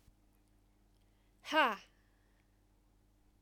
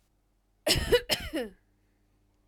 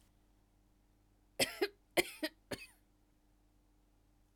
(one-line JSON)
{"exhalation_length": "3.4 s", "exhalation_amplitude": 4915, "exhalation_signal_mean_std_ratio": 0.24, "cough_length": "2.5 s", "cough_amplitude": 10062, "cough_signal_mean_std_ratio": 0.37, "three_cough_length": "4.4 s", "three_cough_amplitude": 5277, "three_cough_signal_mean_std_ratio": 0.24, "survey_phase": "alpha (2021-03-01 to 2021-08-12)", "age": "18-44", "gender": "Female", "wearing_mask": "No", "symptom_fatigue": true, "symptom_headache": true, "symptom_loss_of_taste": true, "smoker_status": "Never smoked", "respiratory_condition_asthma": true, "respiratory_condition_other": false, "recruitment_source": "REACT", "submission_delay": "3 days", "covid_test_result": "Negative", "covid_test_method": "RT-qPCR"}